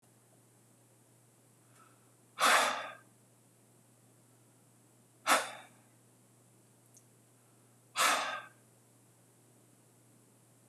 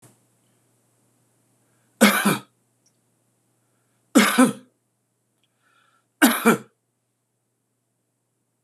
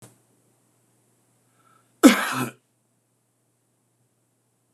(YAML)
exhalation_length: 10.7 s
exhalation_amplitude: 6932
exhalation_signal_mean_std_ratio: 0.28
three_cough_length: 8.6 s
three_cough_amplitude: 25965
three_cough_signal_mean_std_ratio: 0.26
cough_length: 4.7 s
cough_amplitude: 26028
cough_signal_mean_std_ratio: 0.18
survey_phase: beta (2021-08-13 to 2022-03-07)
age: 65+
gender: Male
wearing_mask: 'No'
symptom_none: true
smoker_status: Never smoked
respiratory_condition_asthma: false
respiratory_condition_other: false
recruitment_source: REACT
submission_delay: 1 day
covid_test_result: Negative
covid_test_method: RT-qPCR
influenza_a_test_result: Negative
influenza_b_test_result: Negative